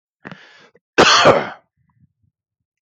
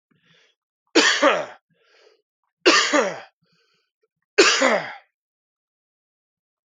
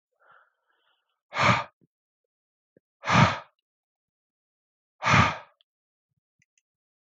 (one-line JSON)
{"cough_length": "2.8 s", "cough_amplitude": 31295, "cough_signal_mean_std_ratio": 0.34, "three_cough_length": "6.7 s", "three_cough_amplitude": 27996, "three_cough_signal_mean_std_ratio": 0.36, "exhalation_length": "7.1 s", "exhalation_amplitude": 18363, "exhalation_signal_mean_std_ratio": 0.27, "survey_phase": "beta (2021-08-13 to 2022-03-07)", "age": "18-44", "gender": "Male", "wearing_mask": "No", "symptom_cough_any": true, "symptom_runny_or_blocked_nose": true, "symptom_abdominal_pain": true, "symptom_fatigue": true, "symptom_headache": true, "symptom_change_to_sense_of_smell_or_taste": true, "symptom_loss_of_taste": true, "symptom_onset": "3 days", "smoker_status": "Ex-smoker", "respiratory_condition_asthma": false, "respiratory_condition_other": false, "recruitment_source": "Test and Trace", "submission_delay": "2 days", "covid_test_result": "Positive", "covid_test_method": "RT-qPCR", "covid_ct_value": 19.5, "covid_ct_gene": "ORF1ab gene", "covid_ct_mean": 19.7, "covid_viral_load": "350000 copies/ml", "covid_viral_load_category": "Low viral load (10K-1M copies/ml)"}